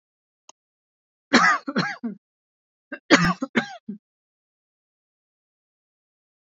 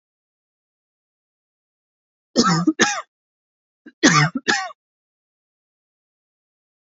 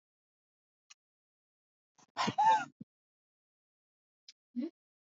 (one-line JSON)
{"three_cough_length": "6.6 s", "three_cough_amplitude": 27837, "three_cough_signal_mean_std_ratio": 0.28, "cough_length": "6.8 s", "cough_amplitude": 29059, "cough_signal_mean_std_ratio": 0.29, "exhalation_length": "5.0 s", "exhalation_amplitude": 4181, "exhalation_signal_mean_std_ratio": 0.25, "survey_phase": "alpha (2021-03-01 to 2021-08-12)", "age": "45-64", "gender": "Female", "wearing_mask": "No", "symptom_fatigue": true, "smoker_status": "Never smoked", "respiratory_condition_asthma": false, "respiratory_condition_other": false, "recruitment_source": "REACT", "submission_delay": "2 days", "covid_test_result": "Negative", "covid_test_method": "RT-qPCR"}